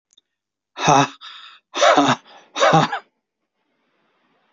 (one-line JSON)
{"exhalation_length": "4.5 s", "exhalation_amplitude": 28472, "exhalation_signal_mean_std_ratio": 0.39, "survey_phase": "alpha (2021-03-01 to 2021-08-12)", "age": "65+", "gender": "Male", "wearing_mask": "No", "symptom_none": true, "smoker_status": "Ex-smoker", "respiratory_condition_asthma": false, "respiratory_condition_other": true, "recruitment_source": "REACT", "submission_delay": "2 days", "covid_test_result": "Negative", "covid_test_method": "RT-qPCR"}